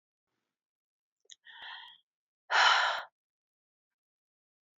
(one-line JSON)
{"exhalation_length": "4.8 s", "exhalation_amplitude": 8866, "exhalation_signal_mean_std_ratio": 0.27, "survey_phase": "beta (2021-08-13 to 2022-03-07)", "age": "45-64", "gender": "Female", "wearing_mask": "No", "symptom_fatigue": true, "symptom_headache": true, "symptom_change_to_sense_of_smell_or_taste": true, "smoker_status": "Never smoked", "respiratory_condition_asthma": false, "respiratory_condition_other": false, "recruitment_source": "REACT", "submission_delay": "1 day", "covid_test_result": "Negative", "covid_test_method": "RT-qPCR", "influenza_a_test_result": "Negative", "influenza_b_test_result": "Negative"}